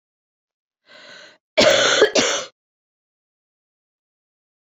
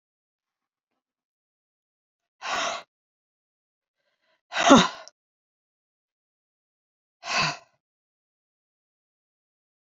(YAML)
cough_length: 4.7 s
cough_amplitude: 28504
cough_signal_mean_std_ratio: 0.33
exhalation_length: 10.0 s
exhalation_amplitude: 27571
exhalation_signal_mean_std_ratio: 0.19
survey_phase: beta (2021-08-13 to 2022-03-07)
age: 18-44
gender: Female
wearing_mask: 'No'
symptom_cough_any: true
symptom_runny_or_blocked_nose: true
symptom_shortness_of_breath: true
symptom_sore_throat: true
symptom_fatigue: true
symptom_headache: true
symptom_onset: 4 days
smoker_status: Never smoked
respiratory_condition_asthma: false
respiratory_condition_other: false
recruitment_source: Test and Trace
submission_delay: 2 days
covid_test_result: Positive
covid_test_method: RT-qPCR